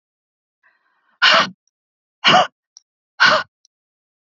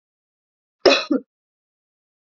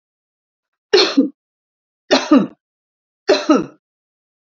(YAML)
exhalation_length: 4.4 s
exhalation_amplitude: 32767
exhalation_signal_mean_std_ratio: 0.32
cough_length: 2.4 s
cough_amplitude: 32768
cough_signal_mean_std_ratio: 0.24
three_cough_length: 4.5 s
three_cough_amplitude: 32031
three_cough_signal_mean_std_ratio: 0.34
survey_phase: beta (2021-08-13 to 2022-03-07)
age: 45-64
gender: Female
wearing_mask: 'No'
symptom_runny_or_blocked_nose: true
symptom_fatigue: true
symptom_headache: true
smoker_status: Never smoked
respiratory_condition_asthma: false
respiratory_condition_other: false
recruitment_source: Test and Trace
submission_delay: 2 days
covid_test_result: Negative
covid_test_method: RT-qPCR